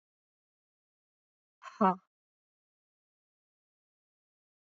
{"exhalation_length": "4.7 s", "exhalation_amplitude": 8704, "exhalation_signal_mean_std_ratio": 0.13, "survey_phase": "beta (2021-08-13 to 2022-03-07)", "age": "18-44", "gender": "Female", "wearing_mask": "No", "symptom_cough_any": true, "symptom_new_continuous_cough": true, "symptom_runny_or_blocked_nose": true, "symptom_shortness_of_breath": true, "symptom_sore_throat": true, "symptom_onset": "3 days", "smoker_status": "Never smoked", "respiratory_condition_asthma": false, "respiratory_condition_other": false, "recruitment_source": "Test and Trace", "submission_delay": "2 days", "covid_test_result": "Positive", "covid_test_method": "ePCR"}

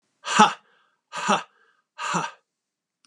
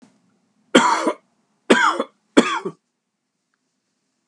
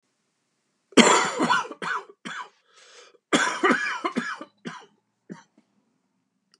{"exhalation_length": "3.1 s", "exhalation_amplitude": 28089, "exhalation_signal_mean_std_ratio": 0.33, "three_cough_length": "4.3 s", "three_cough_amplitude": 32767, "three_cough_signal_mean_std_ratio": 0.34, "cough_length": "6.6 s", "cough_amplitude": 29221, "cough_signal_mean_std_ratio": 0.38, "survey_phase": "beta (2021-08-13 to 2022-03-07)", "age": "45-64", "gender": "Male", "wearing_mask": "No", "symptom_cough_any": true, "symptom_shortness_of_breath": true, "symptom_fatigue": true, "symptom_headache": true, "symptom_change_to_sense_of_smell_or_taste": true, "symptom_loss_of_taste": true, "symptom_onset": "4 days", "smoker_status": "Never smoked", "respiratory_condition_asthma": false, "respiratory_condition_other": false, "recruitment_source": "Test and Trace", "submission_delay": "2 days", "covid_test_result": "Positive", "covid_test_method": "RT-qPCR", "covid_ct_value": 18.0, "covid_ct_gene": "ORF1ab gene", "covid_ct_mean": 18.5, "covid_viral_load": "850000 copies/ml", "covid_viral_load_category": "Low viral load (10K-1M copies/ml)"}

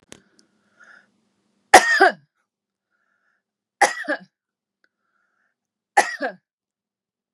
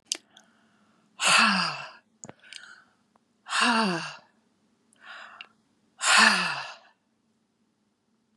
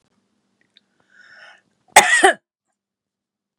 {"three_cough_length": "7.3 s", "three_cough_amplitude": 32768, "three_cough_signal_mean_std_ratio": 0.22, "exhalation_length": "8.4 s", "exhalation_amplitude": 20313, "exhalation_signal_mean_std_ratio": 0.37, "cough_length": "3.6 s", "cough_amplitude": 32768, "cough_signal_mean_std_ratio": 0.24, "survey_phase": "beta (2021-08-13 to 2022-03-07)", "age": "65+", "gender": "Female", "wearing_mask": "No", "symptom_none": true, "smoker_status": "Never smoked", "respiratory_condition_asthma": false, "respiratory_condition_other": false, "recruitment_source": "REACT", "submission_delay": "2 days", "covid_test_result": "Negative", "covid_test_method": "RT-qPCR", "influenza_a_test_result": "Negative", "influenza_b_test_result": "Negative"}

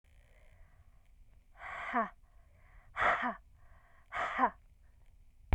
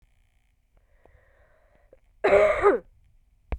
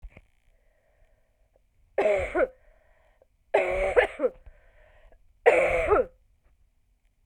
{"exhalation_length": "5.5 s", "exhalation_amplitude": 5140, "exhalation_signal_mean_std_ratio": 0.38, "cough_length": "3.6 s", "cough_amplitude": 17646, "cough_signal_mean_std_ratio": 0.33, "three_cough_length": "7.3 s", "three_cough_amplitude": 18268, "three_cough_signal_mean_std_ratio": 0.39, "survey_phase": "beta (2021-08-13 to 2022-03-07)", "age": "18-44", "gender": "Female", "wearing_mask": "No", "symptom_cough_any": true, "symptom_runny_or_blocked_nose": true, "symptom_fatigue": true, "symptom_headache": true, "symptom_other": true, "smoker_status": "Ex-smoker", "respiratory_condition_asthma": true, "respiratory_condition_other": false, "recruitment_source": "Test and Trace", "submission_delay": "2 days", "covid_test_result": "Positive", "covid_test_method": "RT-qPCR", "covid_ct_value": 26.7, "covid_ct_gene": "ORF1ab gene", "covid_ct_mean": 27.1, "covid_viral_load": "1300 copies/ml", "covid_viral_load_category": "Minimal viral load (< 10K copies/ml)"}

